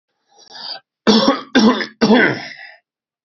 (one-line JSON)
{"three_cough_length": "3.2 s", "three_cough_amplitude": 32768, "three_cough_signal_mean_std_ratio": 0.48, "survey_phase": "beta (2021-08-13 to 2022-03-07)", "age": "45-64", "gender": "Male", "wearing_mask": "No", "symptom_cough_any": true, "symptom_runny_or_blocked_nose": true, "symptom_sore_throat": true, "symptom_headache": true, "symptom_onset": "2 days", "smoker_status": "Ex-smoker", "respiratory_condition_asthma": false, "respiratory_condition_other": false, "recruitment_source": "Test and Trace", "submission_delay": "2 days", "covid_test_result": "Positive", "covid_test_method": "RT-qPCR", "covid_ct_value": 21.7, "covid_ct_gene": "ORF1ab gene", "covid_ct_mean": 22.5, "covid_viral_load": "43000 copies/ml", "covid_viral_load_category": "Low viral load (10K-1M copies/ml)"}